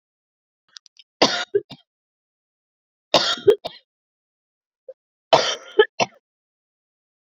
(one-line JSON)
{"three_cough_length": "7.3 s", "three_cough_amplitude": 32382, "three_cough_signal_mean_std_ratio": 0.25, "survey_phase": "beta (2021-08-13 to 2022-03-07)", "age": "45-64", "gender": "Female", "wearing_mask": "No", "symptom_cough_any": true, "symptom_runny_or_blocked_nose": true, "symptom_shortness_of_breath": true, "symptom_abdominal_pain": true, "symptom_diarrhoea": true, "symptom_fatigue": true, "symptom_onset": "5 days", "smoker_status": "Ex-smoker", "respiratory_condition_asthma": false, "respiratory_condition_other": false, "recruitment_source": "Test and Trace", "submission_delay": "2 days", "covid_test_result": "Positive", "covid_test_method": "RT-qPCR", "covid_ct_value": 15.8, "covid_ct_gene": "ORF1ab gene", "covid_ct_mean": 16.3, "covid_viral_load": "4400000 copies/ml", "covid_viral_load_category": "High viral load (>1M copies/ml)"}